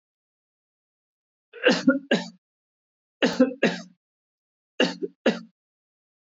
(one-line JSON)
{"three_cough_length": "6.3 s", "three_cough_amplitude": 14964, "three_cough_signal_mean_std_ratio": 0.31, "survey_phase": "beta (2021-08-13 to 2022-03-07)", "age": "45-64", "gender": "Male", "wearing_mask": "No", "symptom_none": true, "smoker_status": "Never smoked", "respiratory_condition_asthma": false, "respiratory_condition_other": false, "recruitment_source": "REACT", "submission_delay": "6 days", "covid_test_result": "Negative", "covid_test_method": "RT-qPCR", "influenza_a_test_result": "Negative", "influenza_b_test_result": "Negative"}